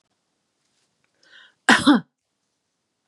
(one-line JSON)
{"cough_length": "3.1 s", "cough_amplitude": 28641, "cough_signal_mean_std_ratio": 0.24, "survey_phase": "beta (2021-08-13 to 2022-03-07)", "age": "45-64", "gender": "Female", "wearing_mask": "No", "symptom_none": true, "smoker_status": "Never smoked", "respiratory_condition_asthma": false, "respiratory_condition_other": false, "recruitment_source": "REACT", "submission_delay": "1 day", "covid_test_result": "Negative", "covid_test_method": "RT-qPCR", "influenza_a_test_result": "Negative", "influenza_b_test_result": "Negative"}